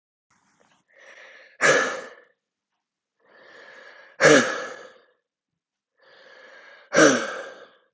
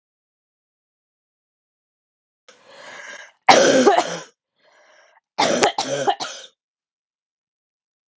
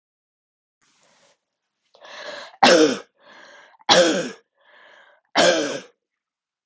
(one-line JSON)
{"exhalation_length": "7.9 s", "exhalation_amplitude": 25410, "exhalation_signal_mean_std_ratio": 0.3, "cough_length": "8.2 s", "cough_amplitude": 32766, "cough_signal_mean_std_ratio": 0.31, "three_cough_length": "6.7 s", "three_cough_amplitude": 32434, "three_cough_signal_mean_std_ratio": 0.34, "survey_phase": "beta (2021-08-13 to 2022-03-07)", "age": "18-44", "gender": "Female", "wearing_mask": "No", "symptom_cough_any": true, "symptom_new_continuous_cough": true, "symptom_runny_or_blocked_nose": true, "symptom_shortness_of_breath": true, "symptom_sore_throat": true, "symptom_diarrhoea": true, "symptom_fever_high_temperature": true, "symptom_change_to_sense_of_smell_or_taste": true, "symptom_loss_of_taste": true, "symptom_other": true, "symptom_onset": "2 days", "smoker_status": "Never smoked", "respiratory_condition_asthma": false, "respiratory_condition_other": false, "recruitment_source": "Test and Trace", "submission_delay": "2 days", "covid_test_result": "Positive", "covid_test_method": "RT-qPCR", "covid_ct_value": 14.7, "covid_ct_gene": "ORF1ab gene", "covid_ct_mean": 14.8, "covid_viral_load": "14000000 copies/ml", "covid_viral_load_category": "High viral load (>1M copies/ml)"}